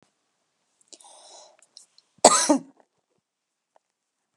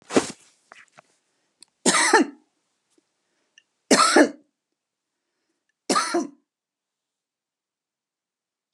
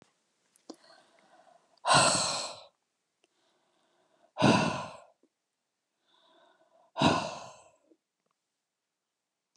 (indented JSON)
{
  "cough_length": "4.4 s",
  "cough_amplitude": 32768,
  "cough_signal_mean_std_ratio": 0.2,
  "three_cough_length": "8.7 s",
  "three_cough_amplitude": 26487,
  "three_cough_signal_mean_std_ratio": 0.28,
  "exhalation_length": "9.6 s",
  "exhalation_amplitude": 10893,
  "exhalation_signal_mean_std_ratio": 0.3,
  "survey_phase": "alpha (2021-03-01 to 2021-08-12)",
  "age": "65+",
  "gender": "Female",
  "wearing_mask": "No",
  "symptom_none": true,
  "smoker_status": "Ex-smoker",
  "respiratory_condition_asthma": false,
  "respiratory_condition_other": false,
  "recruitment_source": "REACT",
  "submission_delay": "2 days",
  "covid_test_result": "Negative",
  "covid_test_method": "RT-qPCR"
}